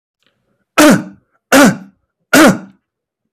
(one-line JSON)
{"three_cough_length": "3.3 s", "three_cough_amplitude": 32768, "three_cough_signal_mean_std_ratio": 0.42, "survey_phase": "beta (2021-08-13 to 2022-03-07)", "age": "45-64", "gender": "Male", "wearing_mask": "No", "symptom_none": true, "smoker_status": "Never smoked", "respiratory_condition_asthma": false, "respiratory_condition_other": false, "recruitment_source": "REACT", "submission_delay": "15 days", "covid_test_result": "Negative", "covid_test_method": "RT-qPCR", "influenza_a_test_result": "Negative", "influenza_b_test_result": "Negative"}